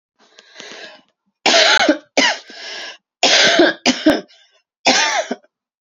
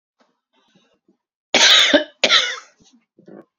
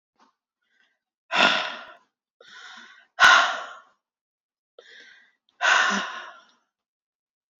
{"three_cough_length": "5.8 s", "three_cough_amplitude": 32767, "three_cough_signal_mean_std_ratio": 0.5, "cough_length": "3.6 s", "cough_amplitude": 32033, "cough_signal_mean_std_ratio": 0.37, "exhalation_length": "7.6 s", "exhalation_amplitude": 26698, "exhalation_signal_mean_std_ratio": 0.32, "survey_phase": "beta (2021-08-13 to 2022-03-07)", "age": "45-64", "gender": "Female", "wearing_mask": "No", "symptom_cough_any": true, "symptom_new_continuous_cough": true, "symptom_runny_or_blocked_nose": true, "symptom_shortness_of_breath": true, "symptom_sore_throat": true, "symptom_abdominal_pain": true, "symptom_fatigue": true, "symptom_fever_high_temperature": true, "symptom_headache": true, "symptom_change_to_sense_of_smell_or_taste": true, "symptom_loss_of_taste": true, "symptom_onset": "2 days", "smoker_status": "Never smoked", "respiratory_condition_asthma": false, "respiratory_condition_other": false, "recruitment_source": "Test and Trace", "submission_delay": "2 days", "covid_test_result": "Positive", "covid_test_method": "RT-qPCR", "covid_ct_value": 19.5, "covid_ct_gene": "ORF1ab gene", "covid_ct_mean": 20.2, "covid_viral_load": "230000 copies/ml", "covid_viral_load_category": "Low viral load (10K-1M copies/ml)"}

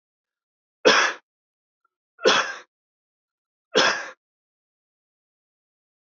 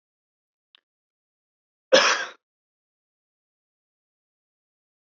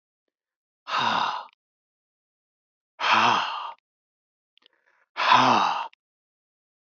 {"three_cough_length": "6.1 s", "three_cough_amplitude": 25671, "three_cough_signal_mean_std_ratio": 0.28, "cough_length": "5.0 s", "cough_amplitude": 23478, "cough_signal_mean_std_ratio": 0.18, "exhalation_length": "6.9 s", "exhalation_amplitude": 19163, "exhalation_signal_mean_std_ratio": 0.4, "survey_phase": "beta (2021-08-13 to 2022-03-07)", "age": "65+", "gender": "Male", "wearing_mask": "No", "symptom_none": true, "smoker_status": "Never smoked", "respiratory_condition_asthma": false, "respiratory_condition_other": false, "recruitment_source": "REACT", "submission_delay": "3 days", "covid_test_result": "Negative", "covid_test_method": "RT-qPCR", "influenza_a_test_result": "Negative", "influenza_b_test_result": "Negative"}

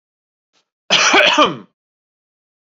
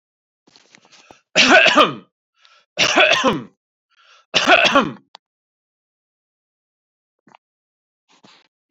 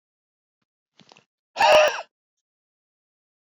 {"cough_length": "2.6 s", "cough_amplitude": 29300, "cough_signal_mean_std_ratio": 0.4, "three_cough_length": "8.7 s", "three_cough_amplitude": 30366, "three_cough_signal_mean_std_ratio": 0.34, "exhalation_length": "3.4 s", "exhalation_amplitude": 19225, "exhalation_signal_mean_std_ratio": 0.27, "survey_phase": "beta (2021-08-13 to 2022-03-07)", "age": "45-64", "gender": "Male", "wearing_mask": "No", "symptom_none": true, "symptom_onset": "12 days", "smoker_status": "Never smoked", "respiratory_condition_asthma": false, "respiratory_condition_other": false, "recruitment_source": "REACT", "submission_delay": "2 days", "covid_test_result": "Negative", "covid_test_method": "RT-qPCR", "influenza_a_test_result": "Unknown/Void", "influenza_b_test_result": "Unknown/Void"}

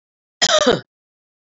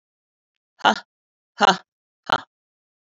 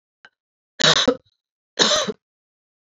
{"cough_length": "1.5 s", "cough_amplitude": 29381, "cough_signal_mean_std_ratio": 0.37, "exhalation_length": "3.1 s", "exhalation_amplitude": 30161, "exhalation_signal_mean_std_ratio": 0.22, "three_cough_length": "2.9 s", "three_cough_amplitude": 29797, "three_cough_signal_mean_std_ratio": 0.35, "survey_phase": "alpha (2021-03-01 to 2021-08-12)", "age": "45-64", "gender": "Female", "wearing_mask": "No", "symptom_cough_any": true, "symptom_change_to_sense_of_smell_or_taste": true, "symptom_loss_of_taste": true, "symptom_onset": "4 days", "smoker_status": "Never smoked", "respiratory_condition_asthma": false, "respiratory_condition_other": false, "recruitment_source": "Test and Trace", "submission_delay": "1 day", "covid_test_result": "Positive", "covid_test_method": "RT-qPCR", "covid_ct_value": 17.3, "covid_ct_gene": "ORF1ab gene", "covid_ct_mean": 17.7, "covid_viral_load": "1600000 copies/ml", "covid_viral_load_category": "High viral load (>1M copies/ml)"}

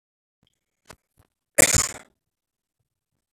{"cough_length": "3.3 s", "cough_amplitude": 30307, "cough_signal_mean_std_ratio": 0.19, "survey_phase": "beta (2021-08-13 to 2022-03-07)", "age": "18-44", "gender": "Male", "wearing_mask": "No", "symptom_none": true, "smoker_status": "Never smoked", "respiratory_condition_asthma": true, "respiratory_condition_other": false, "recruitment_source": "REACT", "submission_delay": "1 day", "covid_test_result": "Negative", "covid_test_method": "RT-qPCR"}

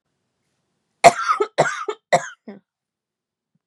{"cough_length": "3.7 s", "cough_amplitude": 32768, "cough_signal_mean_std_ratio": 0.28, "survey_phase": "beta (2021-08-13 to 2022-03-07)", "age": "18-44", "gender": "Female", "wearing_mask": "No", "symptom_none": true, "symptom_onset": "11 days", "smoker_status": "Never smoked", "respiratory_condition_asthma": false, "respiratory_condition_other": false, "recruitment_source": "REACT", "submission_delay": "3 days", "covid_test_result": "Negative", "covid_test_method": "RT-qPCR", "influenza_a_test_result": "Negative", "influenza_b_test_result": "Negative"}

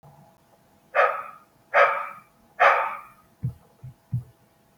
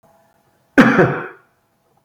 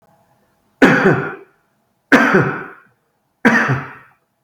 {"exhalation_length": "4.8 s", "exhalation_amplitude": 21854, "exhalation_signal_mean_std_ratio": 0.37, "cough_length": "2.0 s", "cough_amplitude": 32768, "cough_signal_mean_std_ratio": 0.35, "three_cough_length": "4.4 s", "three_cough_amplitude": 32768, "three_cough_signal_mean_std_ratio": 0.44, "survey_phase": "beta (2021-08-13 to 2022-03-07)", "age": "65+", "gender": "Male", "wearing_mask": "No", "symptom_none": true, "smoker_status": "Ex-smoker", "respiratory_condition_asthma": false, "respiratory_condition_other": false, "recruitment_source": "REACT", "submission_delay": "5 days", "covid_test_result": "Negative", "covid_test_method": "RT-qPCR", "influenza_a_test_result": "Negative", "influenza_b_test_result": "Negative"}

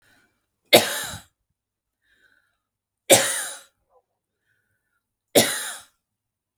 {"three_cough_length": "6.6 s", "three_cough_amplitude": 32768, "three_cough_signal_mean_std_ratio": 0.25, "survey_phase": "beta (2021-08-13 to 2022-03-07)", "age": "45-64", "gender": "Female", "wearing_mask": "No", "symptom_fatigue": true, "smoker_status": "Ex-smoker", "respiratory_condition_asthma": false, "respiratory_condition_other": false, "recruitment_source": "REACT", "submission_delay": "2 days", "covid_test_result": "Negative", "covid_test_method": "RT-qPCR", "influenza_a_test_result": "Negative", "influenza_b_test_result": "Negative"}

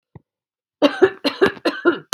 {"three_cough_length": "2.1 s", "three_cough_amplitude": 32757, "three_cough_signal_mean_std_ratio": 0.41, "survey_phase": "beta (2021-08-13 to 2022-03-07)", "age": "45-64", "gender": "Female", "wearing_mask": "No", "symptom_runny_or_blocked_nose": true, "symptom_change_to_sense_of_smell_or_taste": true, "symptom_loss_of_taste": true, "smoker_status": "Never smoked", "respiratory_condition_asthma": false, "respiratory_condition_other": false, "recruitment_source": "Test and Trace", "submission_delay": "2 days", "covid_test_result": "Positive", "covid_test_method": "RT-qPCR"}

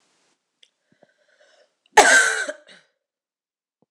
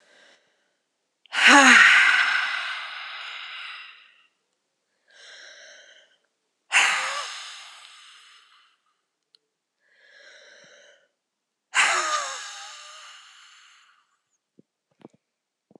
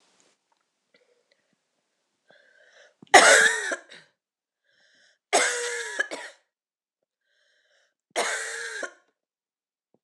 {"cough_length": "3.9 s", "cough_amplitude": 26028, "cough_signal_mean_std_ratio": 0.26, "exhalation_length": "15.8 s", "exhalation_amplitude": 25803, "exhalation_signal_mean_std_ratio": 0.32, "three_cough_length": "10.0 s", "three_cough_amplitude": 26028, "three_cough_signal_mean_std_ratio": 0.27, "survey_phase": "alpha (2021-03-01 to 2021-08-12)", "age": "18-44", "gender": "Female", "wearing_mask": "No", "symptom_fatigue": true, "symptom_fever_high_temperature": true, "symptom_headache": true, "symptom_change_to_sense_of_smell_or_taste": true, "symptom_loss_of_taste": true, "smoker_status": "Never smoked", "respiratory_condition_asthma": false, "respiratory_condition_other": false, "recruitment_source": "Test and Trace", "submission_delay": "1 day", "covid_test_result": "Positive", "covid_test_method": "RT-qPCR"}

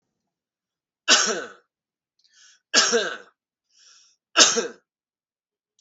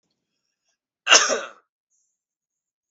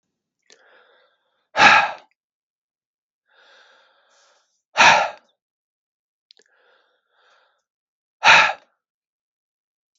{"three_cough_length": "5.8 s", "three_cough_amplitude": 32768, "three_cough_signal_mean_std_ratio": 0.3, "cough_length": "2.9 s", "cough_amplitude": 32768, "cough_signal_mean_std_ratio": 0.23, "exhalation_length": "10.0 s", "exhalation_amplitude": 32768, "exhalation_signal_mean_std_ratio": 0.24, "survey_phase": "beta (2021-08-13 to 2022-03-07)", "age": "45-64", "gender": "Male", "wearing_mask": "No", "symptom_cough_any": true, "symptom_runny_or_blocked_nose": true, "symptom_sore_throat": true, "smoker_status": "Never smoked", "respiratory_condition_asthma": false, "respiratory_condition_other": false, "recruitment_source": "Test and Trace", "submission_delay": "3 days", "covid_test_result": "Positive", "covid_test_method": "RT-qPCR"}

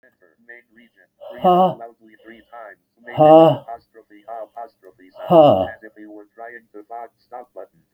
{"exhalation_length": "7.9 s", "exhalation_amplitude": 32768, "exhalation_signal_mean_std_ratio": 0.34, "survey_phase": "beta (2021-08-13 to 2022-03-07)", "age": "65+", "gender": "Male", "wearing_mask": "No", "symptom_runny_or_blocked_nose": true, "symptom_shortness_of_breath": true, "smoker_status": "Ex-smoker", "respiratory_condition_asthma": false, "respiratory_condition_other": false, "recruitment_source": "REACT", "submission_delay": "1 day", "covid_test_result": "Negative", "covid_test_method": "RT-qPCR", "influenza_a_test_result": "Negative", "influenza_b_test_result": "Negative"}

